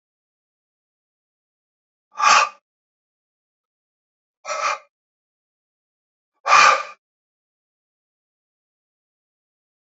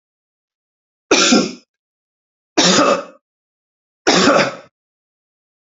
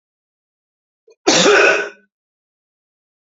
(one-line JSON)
{"exhalation_length": "9.8 s", "exhalation_amplitude": 29984, "exhalation_signal_mean_std_ratio": 0.22, "three_cough_length": "5.7 s", "three_cough_amplitude": 32768, "three_cough_signal_mean_std_ratio": 0.39, "cough_length": "3.2 s", "cough_amplitude": 32768, "cough_signal_mean_std_ratio": 0.35, "survey_phase": "alpha (2021-03-01 to 2021-08-12)", "age": "45-64", "gender": "Male", "wearing_mask": "No", "symptom_fatigue": true, "symptom_fever_high_temperature": true, "symptom_change_to_sense_of_smell_or_taste": true, "symptom_loss_of_taste": true, "smoker_status": "Never smoked", "respiratory_condition_asthma": false, "respiratory_condition_other": false, "recruitment_source": "Test and Trace", "submission_delay": "1 day", "covid_test_result": "Positive", "covid_test_method": "RT-qPCR", "covid_ct_value": 12.6, "covid_ct_gene": "ORF1ab gene", "covid_ct_mean": 13.0, "covid_viral_load": "54000000 copies/ml", "covid_viral_load_category": "High viral load (>1M copies/ml)"}